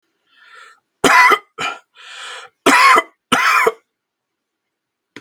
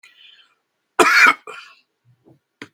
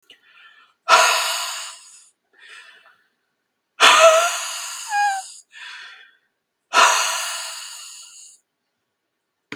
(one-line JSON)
{"three_cough_length": "5.2 s", "three_cough_amplitude": 32768, "three_cough_signal_mean_std_ratio": 0.41, "cough_length": "2.7 s", "cough_amplitude": 32768, "cough_signal_mean_std_ratio": 0.3, "exhalation_length": "9.6 s", "exhalation_amplitude": 32768, "exhalation_signal_mean_std_ratio": 0.4, "survey_phase": "beta (2021-08-13 to 2022-03-07)", "age": "45-64", "gender": "Male", "wearing_mask": "No", "symptom_headache": true, "smoker_status": "Never smoked", "respiratory_condition_asthma": false, "respiratory_condition_other": false, "recruitment_source": "REACT", "submission_delay": "1 day", "covid_test_result": "Negative", "covid_test_method": "RT-qPCR", "influenza_a_test_result": "Negative", "influenza_b_test_result": "Negative"}